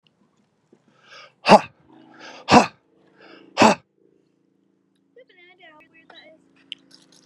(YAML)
exhalation_length: 7.3 s
exhalation_amplitude: 32768
exhalation_signal_mean_std_ratio: 0.2
survey_phase: alpha (2021-03-01 to 2021-08-12)
age: 18-44
gender: Male
wearing_mask: 'Yes'
symptom_cough_any: true
symptom_new_continuous_cough: true
symptom_diarrhoea: true
symptom_fatigue: true
symptom_change_to_sense_of_smell_or_taste: true
symptom_onset: 4 days
smoker_status: Current smoker (11 or more cigarettes per day)
respiratory_condition_asthma: false
respiratory_condition_other: false
recruitment_source: Test and Trace
submission_delay: 2 days
covid_test_result: Positive
covid_test_method: RT-qPCR
covid_ct_value: 41.2
covid_ct_gene: N gene